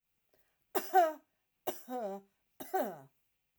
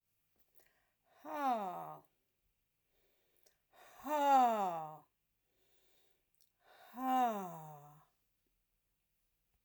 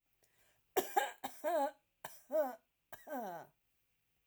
{
  "three_cough_length": "3.6 s",
  "three_cough_amplitude": 5472,
  "three_cough_signal_mean_std_ratio": 0.36,
  "exhalation_length": "9.6 s",
  "exhalation_amplitude": 3303,
  "exhalation_signal_mean_std_ratio": 0.36,
  "cough_length": "4.3 s",
  "cough_amplitude": 4188,
  "cough_signal_mean_std_ratio": 0.42,
  "survey_phase": "alpha (2021-03-01 to 2021-08-12)",
  "age": "45-64",
  "gender": "Female",
  "wearing_mask": "No",
  "symptom_none": true,
  "symptom_onset": "13 days",
  "smoker_status": "Never smoked",
  "respiratory_condition_asthma": false,
  "respiratory_condition_other": false,
  "recruitment_source": "REACT",
  "submission_delay": "1 day",
  "covid_test_result": "Negative",
  "covid_test_method": "RT-qPCR"
}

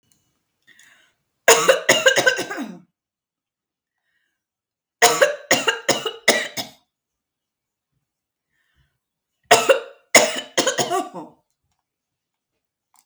{
  "three_cough_length": "13.1 s",
  "three_cough_amplitude": 32768,
  "three_cough_signal_mean_std_ratio": 0.33,
  "survey_phase": "beta (2021-08-13 to 2022-03-07)",
  "age": "45-64",
  "gender": "Female",
  "wearing_mask": "No",
  "symptom_none": true,
  "smoker_status": "Never smoked",
  "respiratory_condition_asthma": false,
  "respiratory_condition_other": false,
  "recruitment_source": "REACT",
  "submission_delay": "3 days",
  "covid_test_result": "Negative",
  "covid_test_method": "RT-qPCR",
  "influenza_a_test_result": "Negative",
  "influenza_b_test_result": "Negative"
}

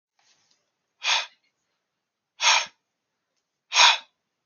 {
  "exhalation_length": "4.5 s",
  "exhalation_amplitude": 24842,
  "exhalation_signal_mean_std_ratio": 0.29,
  "survey_phase": "alpha (2021-03-01 to 2021-08-12)",
  "age": "18-44",
  "gender": "Male",
  "wearing_mask": "No",
  "symptom_none": true,
  "smoker_status": "Never smoked",
  "respiratory_condition_asthma": false,
  "respiratory_condition_other": false,
  "recruitment_source": "REACT",
  "submission_delay": "1 day",
  "covid_test_result": "Negative",
  "covid_test_method": "RT-qPCR"
}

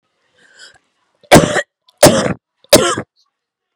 {
  "three_cough_length": "3.8 s",
  "three_cough_amplitude": 32768,
  "three_cough_signal_mean_std_ratio": 0.34,
  "survey_phase": "beta (2021-08-13 to 2022-03-07)",
  "age": "18-44",
  "gender": "Female",
  "wearing_mask": "No",
  "symptom_cough_any": true,
  "symptom_runny_or_blocked_nose": true,
  "symptom_sore_throat": true,
  "symptom_fatigue": true,
  "symptom_loss_of_taste": true,
  "symptom_onset": "4 days",
  "smoker_status": "Never smoked",
  "respiratory_condition_asthma": false,
  "respiratory_condition_other": false,
  "recruitment_source": "Test and Trace",
  "submission_delay": "1 day",
  "covid_test_result": "Positive",
  "covid_test_method": "RT-qPCR",
  "covid_ct_value": 15.8,
  "covid_ct_gene": "ORF1ab gene",
  "covid_ct_mean": 16.0,
  "covid_viral_load": "5800000 copies/ml",
  "covid_viral_load_category": "High viral load (>1M copies/ml)"
}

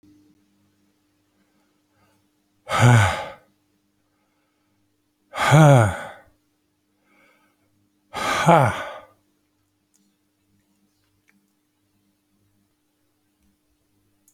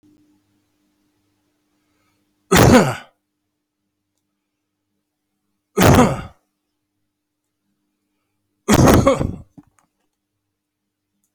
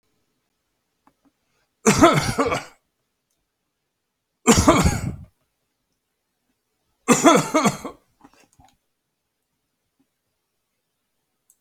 {
  "exhalation_length": "14.3 s",
  "exhalation_amplitude": 28389,
  "exhalation_signal_mean_std_ratio": 0.26,
  "cough_length": "11.3 s",
  "cough_amplitude": 32768,
  "cough_signal_mean_std_ratio": 0.28,
  "three_cough_length": "11.6 s",
  "three_cough_amplitude": 28951,
  "three_cough_signal_mean_std_ratio": 0.29,
  "survey_phase": "alpha (2021-03-01 to 2021-08-12)",
  "age": "65+",
  "gender": "Male",
  "wearing_mask": "No",
  "symptom_none": true,
  "smoker_status": "Ex-smoker",
  "respiratory_condition_asthma": false,
  "respiratory_condition_other": false,
  "recruitment_source": "REACT",
  "submission_delay": "2 days",
  "covid_test_result": "Negative",
  "covid_test_method": "RT-qPCR"
}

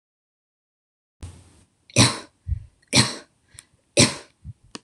{
  "three_cough_length": "4.8 s",
  "three_cough_amplitude": 25901,
  "three_cough_signal_mean_std_ratio": 0.28,
  "survey_phase": "beta (2021-08-13 to 2022-03-07)",
  "age": "18-44",
  "gender": "Female",
  "wearing_mask": "No",
  "symptom_none": true,
  "smoker_status": "Never smoked",
  "respiratory_condition_asthma": false,
  "respiratory_condition_other": false,
  "recruitment_source": "REACT",
  "submission_delay": "0 days",
  "covid_test_result": "Negative",
  "covid_test_method": "RT-qPCR"
}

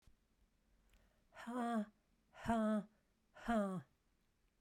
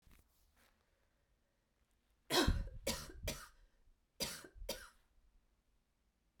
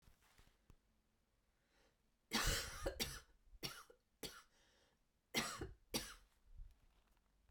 {
  "exhalation_length": "4.6 s",
  "exhalation_amplitude": 1635,
  "exhalation_signal_mean_std_ratio": 0.45,
  "cough_length": "6.4 s",
  "cough_amplitude": 3102,
  "cough_signal_mean_std_ratio": 0.32,
  "three_cough_length": "7.5 s",
  "three_cough_amplitude": 1722,
  "three_cough_signal_mean_std_ratio": 0.37,
  "survey_phase": "alpha (2021-03-01 to 2021-08-12)",
  "age": "45-64",
  "gender": "Female",
  "wearing_mask": "No",
  "symptom_cough_any": true,
  "symptom_fatigue": true,
  "symptom_headache": true,
  "symptom_change_to_sense_of_smell_or_taste": true,
  "smoker_status": "Never smoked",
  "respiratory_condition_asthma": false,
  "respiratory_condition_other": false,
  "recruitment_source": "Test and Trace",
  "submission_delay": "2 days",
  "covid_test_result": "Positive",
  "covid_test_method": "RT-qPCR",
  "covid_ct_value": 16.1,
  "covid_ct_gene": "ORF1ab gene",
  "covid_ct_mean": 16.6,
  "covid_viral_load": "3600000 copies/ml",
  "covid_viral_load_category": "High viral load (>1M copies/ml)"
}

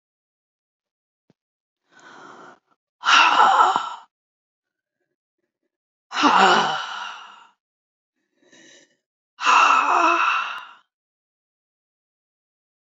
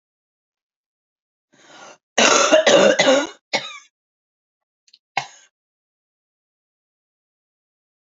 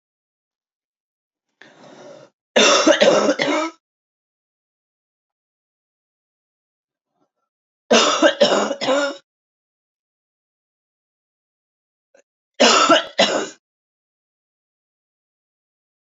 {
  "exhalation_length": "13.0 s",
  "exhalation_amplitude": 26718,
  "exhalation_signal_mean_std_ratio": 0.37,
  "cough_length": "8.0 s",
  "cough_amplitude": 30124,
  "cough_signal_mean_std_ratio": 0.31,
  "three_cough_length": "16.0 s",
  "three_cough_amplitude": 31409,
  "three_cough_signal_mean_std_ratio": 0.33,
  "survey_phase": "beta (2021-08-13 to 2022-03-07)",
  "age": "65+",
  "gender": "Female",
  "wearing_mask": "No",
  "symptom_cough_any": true,
  "symptom_runny_or_blocked_nose": true,
  "symptom_sore_throat": true,
  "symptom_fatigue": true,
  "symptom_change_to_sense_of_smell_or_taste": true,
  "smoker_status": "Never smoked",
  "respiratory_condition_asthma": false,
  "respiratory_condition_other": false,
  "recruitment_source": "Test and Trace",
  "submission_delay": "2 days",
  "covid_test_result": "Positive",
  "covid_test_method": "RT-qPCR",
  "covid_ct_value": 20.9,
  "covid_ct_gene": "N gene",
  "covid_ct_mean": 21.2,
  "covid_viral_load": "110000 copies/ml",
  "covid_viral_load_category": "Low viral load (10K-1M copies/ml)"
}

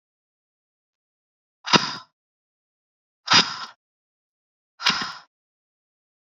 {
  "exhalation_length": "6.3 s",
  "exhalation_amplitude": 29131,
  "exhalation_signal_mean_std_ratio": 0.23,
  "survey_phase": "beta (2021-08-13 to 2022-03-07)",
  "age": "18-44",
  "gender": "Female",
  "wearing_mask": "No",
  "symptom_none": true,
  "smoker_status": "Never smoked",
  "respiratory_condition_asthma": false,
  "respiratory_condition_other": false,
  "recruitment_source": "REACT",
  "submission_delay": "8 days",
  "covid_test_result": "Negative",
  "covid_test_method": "RT-qPCR"
}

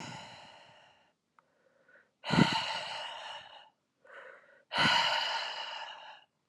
{
  "exhalation_length": "6.5 s",
  "exhalation_amplitude": 10107,
  "exhalation_signal_mean_std_ratio": 0.45,
  "survey_phase": "alpha (2021-03-01 to 2021-08-12)",
  "age": "18-44",
  "gender": "Female",
  "wearing_mask": "No",
  "symptom_new_continuous_cough": true,
  "symptom_fatigue": true,
  "symptom_headache": true,
  "symptom_onset": "4 days",
  "smoker_status": "Ex-smoker",
  "respiratory_condition_asthma": false,
  "respiratory_condition_other": false,
  "recruitment_source": "Test and Trace",
  "submission_delay": "2 days",
  "covid_test_result": "Positive",
  "covid_test_method": "RT-qPCR",
  "covid_ct_value": 22.8,
  "covid_ct_gene": "ORF1ab gene",
  "covid_ct_mean": 23.0,
  "covid_viral_load": "29000 copies/ml",
  "covid_viral_load_category": "Low viral load (10K-1M copies/ml)"
}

